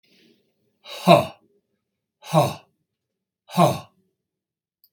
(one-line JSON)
{"three_cough_length": "4.9 s", "three_cough_amplitude": 32767, "three_cough_signal_mean_std_ratio": 0.27, "survey_phase": "beta (2021-08-13 to 2022-03-07)", "age": "45-64", "gender": "Male", "wearing_mask": "No", "symptom_none": true, "smoker_status": "Never smoked", "respiratory_condition_asthma": false, "respiratory_condition_other": false, "recruitment_source": "REACT", "submission_delay": "2 days", "covid_test_result": "Negative", "covid_test_method": "RT-qPCR", "influenza_a_test_result": "Unknown/Void", "influenza_b_test_result": "Unknown/Void"}